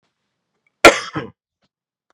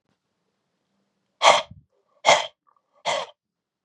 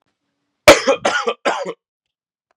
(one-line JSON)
{"cough_length": "2.1 s", "cough_amplitude": 32768, "cough_signal_mean_std_ratio": 0.2, "exhalation_length": "3.8 s", "exhalation_amplitude": 30270, "exhalation_signal_mean_std_ratio": 0.27, "three_cough_length": "2.6 s", "three_cough_amplitude": 32768, "three_cough_signal_mean_std_ratio": 0.34, "survey_phase": "beta (2021-08-13 to 2022-03-07)", "age": "45-64", "gender": "Male", "wearing_mask": "No", "symptom_none": true, "smoker_status": "Ex-smoker", "respiratory_condition_asthma": false, "respiratory_condition_other": false, "recruitment_source": "Test and Trace", "submission_delay": "2 days", "covid_test_result": "Positive", "covid_test_method": "RT-qPCR"}